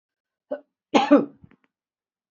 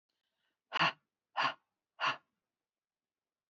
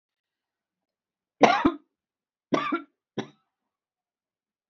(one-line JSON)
{"cough_length": "2.3 s", "cough_amplitude": 25806, "cough_signal_mean_std_ratio": 0.27, "exhalation_length": "3.5 s", "exhalation_amplitude": 3845, "exhalation_signal_mean_std_ratio": 0.28, "three_cough_length": "4.7 s", "three_cough_amplitude": 26398, "three_cough_signal_mean_std_ratio": 0.24, "survey_phase": "beta (2021-08-13 to 2022-03-07)", "age": "65+", "gender": "Female", "wearing_mask": "No", "symptom_none": true, "smoker_status": "Ex-smoker", "respiratory_condition_asthma": false, "respiratory_condition_other": false, "recruitment_source": "Test and Trace", "submission_delay": "1 day", "covid_test_result": "Negative", "covid_test_method": "ePCR"}